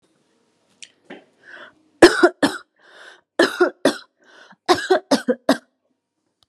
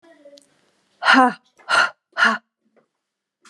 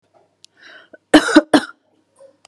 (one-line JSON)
{"three_cough_length": "6.5 s", "three_cough_amplitude": 32768, "three_cough_signal_mean_std_ratio": 0.3, "exhalation_length": "3.5 s", "exhalation_amplitude": 29388, "exhalation_signal_mean_std_ratio": 0.35, "cough_length": "2.5 s", "cough_amplitude": 32768, "cough_signal_mean_std_ratio": 0.27, "survey_phase": "beta (2021-08-13 to 2022-03-07)", "age": "45-64", "gender": "Female", "wearing_mask": "No", "symptom_sore_throat": true, "symptom_headache": true, "symptom_other": true, "symptom_onset": "5 days", "smoker_status": "Ex-smoker", "respiratory_condition_asthma": true, "respiratory_condition_other": false, "recruitment_source": "Test and Trace", "submission_delay": "2 days", "covid_test_result": "Positive", "covid_test_method": "ePCR"}